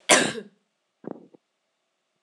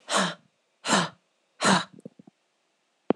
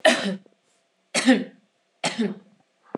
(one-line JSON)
{"cough_length": "2.2 s", "cough_amplitude": 26027, "cough_signal_mean_std_ratio": 0.26, "exhalation_length": "3.2 s", "exhalation_amplitude": 16654, "exhalation_signal_mean_std_ratio": 0.37, "three_cough_length": "3.0 s", "three_cough_amplitude": 23613, "three_cough_signal_mean_std_ratio": 0.39, "survey_phase": "alpha (2021-03-01 to 2021-08-12)", "age": "18-44", "gender": "Female", "wearing_mask": "No", "symptom_fatigue": true, "symptom_onset": "6 days", "smoker_status": "Never smoked", "respiratory_condition_asthma": false, "respiratory_condition_other": false, "recruitment_source": "REACT", "submission_delay": "1 day", "covid_test_result": "Negative", "covid_test_method": "RT-qPCR"}